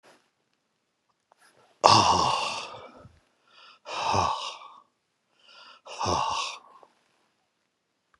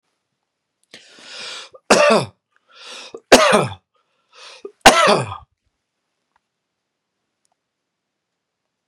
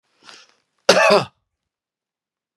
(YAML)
exhalation_length: 8.2 s
exhalation_amplitude: 32768
exhalation_signal_mean_std_ratio: 0.36
three_cough_length: 8.9 s
three_cough_amplitude: 32768
three_cough_signal_mean_std_ratio: 0.28
cough_length: 2.6 s
cough_amplitude: 32768
cough_signal_mean_std_ratio: 0.29
survey_phase: beta (2021-08-13 to 2022-03-07)
age: 45-64
gender: Male
wearing_mask: 'No'
symptom_none: true
smoker_status: Ex-smoker
respiratory_condition_asthma: false
respiratory_condition_other: false
recruitment_source: Test and Trace
submission_delay: 1 day
covid_test_result: Negative
covid_test_method: RT-qPCR